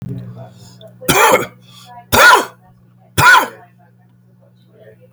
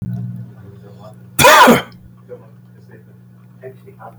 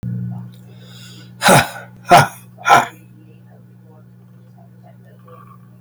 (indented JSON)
{
  "three_cough_length": "5.1 s",
  "three_cough_amplitude": 32768,
  "three_cough_signal_mean_std_ratio": 0.4,
  "cough_length": "4.2 s",
  "cough_amplitude": 32768,
  "cough_signal_mean_std_ratio": 0.36,
  "exhalation_length": "5.8 s",
  "exhalation_amplitude": 32768,
  "exhalation_signal_mean_std_ratio": 0.34,
  "survey_phase": "beta (2021-08-13 to 2022-03-07)",
  "age": "45-64",
  "gender": "Male",
  "wearing_mask": "No",
  "symptom_none": true,
  "smoker_status": "Never smoked",
  "respiratory_condition_asthma": false,
  "respiratory_condition_other": false,
  "recruitment_source": "REACT",
  "submission_delay": "1 day",
  "covid_test_result": "Negative",
  "covid_test_method": "RT-qPCR",
  "influenza_a_test_result": "Negative",
  "influenza_b_test_result": "Negative"
}